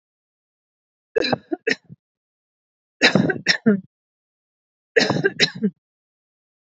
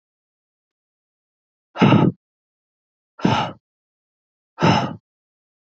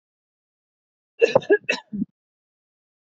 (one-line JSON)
{"three_cough_length": "6.7 s", "three_cough_amplitude": 27560, "three_cough_signal_mean_std_ratio": 0.33, "exhalation_length": "5.7 s", "exhalation_amplitude": 25834, "exhalation_signal_mean_std_ratio": 0.3, "cough_length": "3.2 s", "cough_amplitude": 25774, "cough_signal_mean_std_ratio": 0.24, "survey_phase": "beta (2021-08-13 to 2022-03-07)", "age": "45-64", "gender": "Female", "wearing_mask": "No", "symptom_none": true, "smoker_status": "Ex-smoker", "respiratory_condition_asthma": false, "respiratory_condition_other": false, "recruitment_source": "REACT", "submission_delay": "3 days", "covid_test_result": "Negative", "covid_test_method": "RT-qPCR", "influenza_a_test_result": "Negative", "influenza_b_test_result": "Negative"}